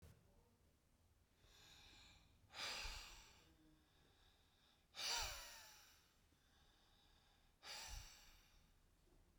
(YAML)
exhalation_length: 9.4 s
exhalation_amplitude: 701
exhalation_signal_mean_std_ratio: 0.45
survey_phase: beta (2021-08-13 to 2022-03-07)
age: 65+
gender: Male
wearing_mask: 'No'
symptom_none: true
smoker_status: Never smoked
respiratory_condition_asthma: false
respiratory_condition_other: false
recruitment_source: REACT
submission_delay: 1 day
covid_test_result: Negative
covid_test_method: RT-qPCR